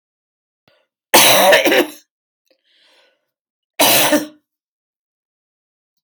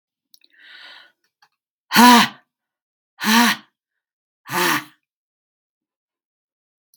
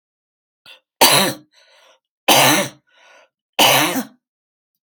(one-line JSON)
{"cough_length": "6.0 s", "cough_amplitude": 32768, "cough_signal_mean_std_ratio": 0.37, "exhalation_length": "7.0 s", "exhalation_amplitude": 32768, "exhalation_signal_mean_std_ratio": 0.27, "three_cough_length": "4.8 s", "three_cough_amplitude": 32768, "three_cough_signal_mean_std_ratio": 0.4, "survey_phase": "beta (2021-08-13 to 2022-03-07)", "age": "65+", "gender": "Female", "wearing_mask": "No", "symptom_cough_any": true, "symptom_fatigue": true, "symptom_loss_of_taste": true, "symptom_onset": "12 days", "smoker_status": "Ex-smoker", "respiratory_condition_asthma": false, "respiratory_condition_other": false, "recruitment_source": "REACT", "submission_delay": "12 days", "covid_test_result": "Negative", "covid_test_method": "RT-qPCR", "influenza_a_test_result": "Negative", "influenza_b_test_result": "Negative"}